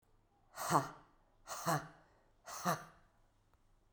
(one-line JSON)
{"exhalation_length": "3.9 s", "exhalation_amplitude": 4855, "exhalation_signal_mean_std_ratio": 0.36, "survey_phase": "beta (2021-08-13 to 2022-03-07)", "age": "45-64", "gender": "Female", "wearing_mask": "No", "symptom_cough_any": true, "symptom_shortness_of_breath": true, "symptom_fever_high_temperature": true, "symptom_change_to_sense_of_smell_or_taste": true, "symptom_onset": "4 days", "smoker_status": "Never smoked", "respiratory_condition_asthma": true, "respiratory_condition_other": false, "recruitment_source": "Test and Trace", "submission_delay": "1 day", "covid_test_result": "Positive", "covid_test_method": "RT-qPCR", "covid_ct_value": 14.8, "covid_ct_gene": "ORF1ab gene", "covid_ct_mean": 15.6, "covid_viral_load": "7800000 copies/ml", "covid_viral_load_category": "High viral load (>1M copies/ml)"}